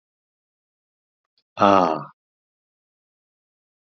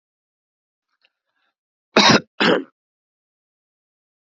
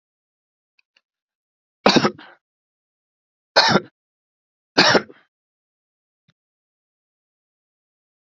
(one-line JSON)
{"exhalation_length": "3.9 s", "exhalation_amplitude": 27379, "exhalation_signal_mean_std_ratio": 0.21, "cough_length": "4.3 s", "cough_amplitude": 32767, "cough_signal_mean_std_ratio": 0.25, "three_cough_length": "8.3 s", "three_cough_amplitude": 31074, "three_cough_signal_mean_std_ratio": 0.22, "survey_phase": "alpha (2021-03-01 to 2021-08-12)", "age": "45-64", "gender": "Male", "wearing_mask": "No", "symptom_none": true, "smoker_status": "Never smoked", "respiratory_condition_asthma": false, "respiratory_condition_other": false, "recruitment_source": "REACT", "submission_delay": "1 day", "covid_test_result": "Negative", "covid_test_method": "RT-qPCR"}